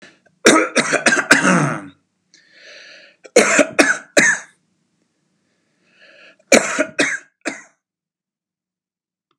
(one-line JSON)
{"three_cough_length": "9.4 s", "three_cough_amplitude": 32768, "three_cough_signal_mean_std_ratio": 0.39, "survey_phase": "beta (2021-08-13 to 2022-03-07)", "age": "45-64", "gender": "Male", "wearing_mask": "No", "symptom_none": true, "smoker_status": "Never smoked", "respiratory_condition_asthma": false, "respiratory_condition_other": false, "recruitment_source": "REACT", "submission_delay": "0 days", "covid_test_result": "Negative", "covid_test_method": "RT-qPCR", "influenza_a_test_result": "Negative", "influenza_b_test_result": "Negative"}